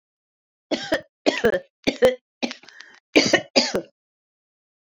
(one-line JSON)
{"cough_length": "4.9 s", "cough_amplitude": 27266, "cough_signal_mean_std_ratio": 0.36, "survey_phase": "beta (2021-08-13 to 2022-03-07)", "age": "65+", "gender": "Female", "wearing_mask": "No", "symptom_cough_any": true, "symptom_runny_or_blocked_nose": true, "symptom_headache": true, "symptom_other": true, "smoker_status": "Never smoked", "respiratory_condition_asthma": false, "respiratory_condition_other": false, "recruitment_source": "Test and Trace", "submission_delay": "2 days", "covid_test_result": "Positive", "covid_test_method": "RT-qPCR", "covid_ct_value": 13.6, "covid_ct_gene": "ORF1ab gene", "covid_ct_mean": 14.0, "covid_viral_load": "25000000 copies/ml", "covid_viral_load_category": "High viral load (>1M copies/ml)"}